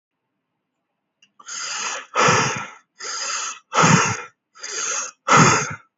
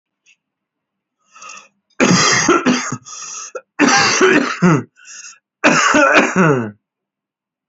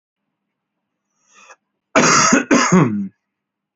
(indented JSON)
{
  "exhalation_length": "6.0 s",
  "exhalation_amplitude": 28719,
  "exhalation_signal_mean_std_ratio": 0.49,
  "three_cough_length": "7.7 s",
  "three_cough_amplitude": 32767,
  "three_cough_signal_mean_std_ratio": 0.54,
  "cough_length": "3.8 s",
  "cough_amplitude": 29346,
  "cough_signal_mean_std_ratio": 0.43,
  "survey_phase": "beta (2021-08-13 to 2022-03-07)",
  "age": "18-44",
  "gender": "Male",
  "wearing_mask": "Yes",
  "symptom_runny_or_blocked_nose": true,
  "symptom_fever_high_temperature": true,
  "symptom_headache": true,
  "symptom_onset": "5 days",
  "smoker_status": "Current smoker (1 to 10 cigarettes per day)",
  "respiratory_condition_asthma": false,
  "respiratory_condition_other": false,
  "recruitment_source": "Test and Trace",
  "submission_delay": "1 day",
  "covid_test_result": "Positive",
  "covid_test_method": "RT-qPCR",
  "covid_ct_value": 25.4,
  "covid_ct_gene": "ORF1ab gene",
  "covid_ct_mean": 25.8,
  "covid_viral_load": "3400 copies/ml",
  "covid_viral_load_category": "Minimal viral load (< 10K copies/ml)"
}